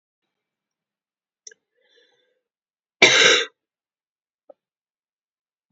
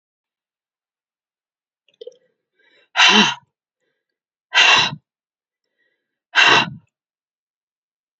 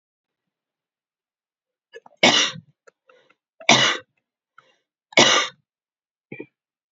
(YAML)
cough_length: 5.7 s
cough_amplitude: 29169
cough_signal_mean_std_ratio: 0.21
exhalation_length: 8.2 s
exhalation_amplitude: 30606
exhalation_signal_mean_std_ratio: 0.29
three_cough_length: 6.9 s
three_cough_amplitude: 32767
three_cough_signal_mean_std_ratio: 0.27
survey_phase: beta (2021-08-13 to 2022-03-07)
age: 45-64
gender: Female
wearing_mask: 'No'
symptom_cough_any: true
symptom_runny_or_blocked_nose: true
symptom_sore_throat: true
symptom_fatigue: true
symptom_headache: true
symptom_change_to_sense_of_smell_or_taste: true
symptom_loss_of_taste: true
symptom_onset: 3 days
smoker_status: Never smoked
respiratory_condition_asthma: false
respiratory_condition_other: false
recruitment_source: Test and Trace
submission_delay: 1 day
covid_test_result: Positive
covid_test_method: RT-qPCR
covid_ct_value: 11.6
covid_ct_gene: ORF1ab gene
covid_ct_mean: 11.9
covid_viral_load: 120000000 copies/ml
covid_viral_load_category: High viral load (>1M copies/ml)